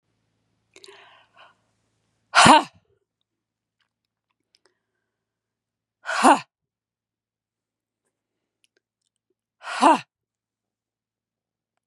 {
  "exhalation_length": "11.9 s",
  "exhalation_amplitude": 32349,
  "exhalation_signal_mean_std_ratio": 0.19,
  "survey_phase": "beta (2021-08-13 to 2022-03-07)",
  "age": "45-64",
  "gender": "Female",
  "wearing_mask": "No",
  "symptom_fatigue": true,
  "symptom_onset": "12 days",
  "smoker_status": "Never smoked",
  "respiratory_condition_asthma": false,
  "respiratory_condition_other": false,
  "recruitment_source": "REACT",
  "submission_delay": "2 days",
  "covid_test_result": "Negative",
  "covid_test_method": "RT-qPCR",
  "influenza_a_test_result": "Negative",
  "influenza_b_test_result": "Negative"
}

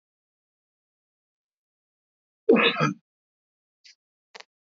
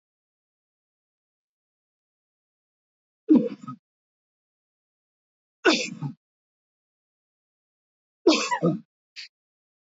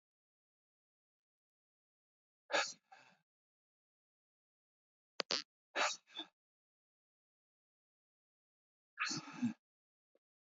{
  "cough_length": "4.6 s",
  "cough_amplitude": 14130,
  "cough_signal_mean_std_ratio": 0.22,
  "three_cough_length": "9.9 s",
  "three_cough_amplitude": 15003,
  "three_cough_signal_mean_std_ratio": 0.23,
  "exhalation_length": "10.5 s",
  "exhalation_amplitude": 5337,
  "exhalation_signal_mean_std_ratio": 0.22,
  "survey_phase": "beta (2021-08-13 to 2022-03-07)",
  "age": "45-64",
  "gender": "Male",
  "wearing_mask": "No",
  "symptom_runny_or_blocked_nose": true,
  "symptom_fatigue": true,
  "smoker_status": "Ex-smoker",
  "respiratory_condition_asthma": false,
  "respiratory_condition_other": false,
  "recruitment_source": "REACT",
  "submission_delay": "2 days",
  "covid_test_result": "Negative",
  "covid_test_method": "RT-qPCR",
  "influenza_a_test_result": "Unknown/Void",
  "influenza_b_test_result": "Unknown/Void"
}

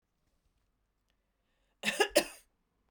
{
  "cough_length": "2.9 s",
  "cough_amplitude": 8066,
  "cough_signal_mean_std_ratio": 0.23,
  "survey_phase": "beta (2021-08-13 to 2022-03-07)",
  "age": "45-64",
  "gender": "Female",
  "wearing_mask": "No",
  "symptom_cough_any": true,
  "symptom_runny_or_blocked_nose": true,
  "symptom_fatigue": true,
  "symptom_fever_high_temperature": true,
  "symptom_change_to_sense_of_smell_or_taste": true,
  "symptom_loss_of_taste": true,
  "symptom_onset": "5 days",
  "smoker_status": "Never smoked",
  "respiratory_condition_asthma": false,
  "respiratory_condition_other": false,
  "recruitment_source": "Test and Trace",
  "submission_delay": "2 days",
  "covid_test_result": "Positive",
  "covid_test_method": "RT-qPCR",
  "covid_ct_value": 16.5,
  "covid_ct_gene": "ORF1ab gene",
  "covid_ct_mean": 17.3,
  "covid_viral_load": "2200000 copies/ml",
  "covid_viral_load_category": "High viral load (>1M copies/ml)"
}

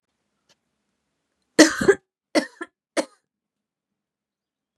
{
  "three_cough_length": "4.8 s",
  "three_cough_amplitude": 32758,
  "three_cough_signal_mean_std_ratio": 0.2,
  "survey_phase": "beta (2021-08-13 to 2022-03-07)",
  "age": "45-64",
  "gender": "Female",
  "wearing_mask": "No",
  "symptom_cough_any": true,
  "symptom_sore_throat": true,
  "symptom_headache": true,
  "symptom_onset": "5 days",
  "smoker_status": "Ex-smoker",
  "respiratory_condition_asthma": false,
  "respiratory_condition_other": false,
  "recruitment_source": "Test and Trace",
  "submission_delay": "2 days",
  "covid_test_result": "Positive",
  "covid_test_method": "RT-qPCR",
  "covid_ct_value": 19.9,
  "covid_ct_gene": "N gene"
}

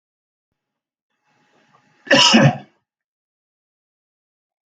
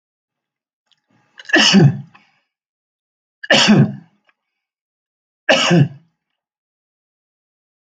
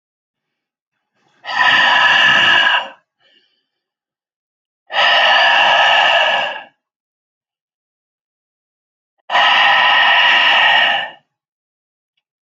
{
  "cough_length": "4.8 s",
  "cough_amplitude": 30373,
  "cough_signal_mean_std_ratio": 0.25,
  "three_cough_length": "7.9 s",
  "three_cough_amplitude": 32767,
  "three_cough_signal_mean_std_ratio": 0.33,
  "exhalation_length": "12.5 s",
  "exhalation_amplitude": 30792,
  "exhalation_signal_mean_std_ratio": 0.56,
  "survey_phase": "alpha (2021-03-01 to 2021-08-12)",
  "age": "65+",
  "gender": "Male",
  "wearing_mask": "No",
  "symptom_fatigue": true,
  "smoker_status": "Never smoked",
  "respiratory_condition_asthma": false,
  "respiratory_condition_other": false,
  "recruitment_source": "REACT",
  "submission_delay": "1 day",
  "covid_test_result": "Negative",
  "covid_test_method": "RT-qPCR"
}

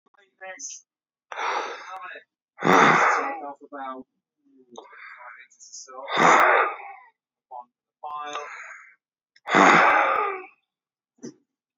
{
  "exhalation_length": "11.8 s",
  "exhalation_amplitude": 27688,
  "exhalation_signal_mean_std_ratio": 0.42,
  "survey_phase": "beta (2021-08-13 to 2022-03-07)",
  "age": "45-64",
  "gender": "Male",
  "wearing_mask": "No",
  "symptom_shortness_of_breath": true,
  "symptom_headache": true,
  "smoker_status": "Current smoker (11 or more cigarettes per day)",
  "respiratory_condition_asthma": false,
  "respiratory_condition_other": true,
  "recruitment_source": "REACT",
  "submission_delay": "2 days",
  "covid_test_result": "Negative",
  "covid_test_method": "RT-qPCR",
  "influenza_a_test_result": "Negative",
  "influenza_b_test_result": "Negative"
}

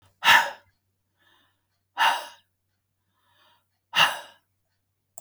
{
  "exhalation_length": "5.2 s",
  "exhalation_amplitude": 25168,
  "exhalation_signal_mean_std_ratio": 0.27,
  "survey_phase": "beta (2021-08-13 to 2022-03-07)",
  "age": "65+",
  "gender": "Female",
  "wearing_mask": "No",
  "symptom_new_continuous_cough": true,
  "symptom_sore_throat": true,
  "symptom_onset": "12 days",
  "smoker_status": "Ex-smoker",
  "respiratory_condition_asthma": false,
  "respiratory_condition_other": false,
  "recruitment_source": "REACT",
  "submission_delay": "3 days",
  "covid_test_result": "Negative",
  "covid_test_method": "RT-qPCR",
  "influenza_a_test_result": "Negative",
  "influenza_b_test_result": "Negative"
}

